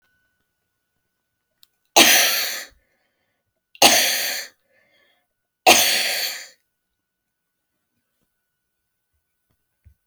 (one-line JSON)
{"three_cough_length": "10.1 s", "three_cough_amplitude": 32768, "three_cough_signal_mean_std_ratio": 0.31, "survey_phase": "beta (2021-08-13 to 2022-03-07)", "age": "65+", "gender": "Female", "wearing_mask": "No", "symptom_fatigue": true, "smoker_status": "Never smoked", "respiratory_condition_asthma": false, "respiratory_condition_other": false, "recruitment_source": "REACT", "submission_delay": "1 day", "covid_test_result": "Negative", "covid_test_method": "RT-qPCR"}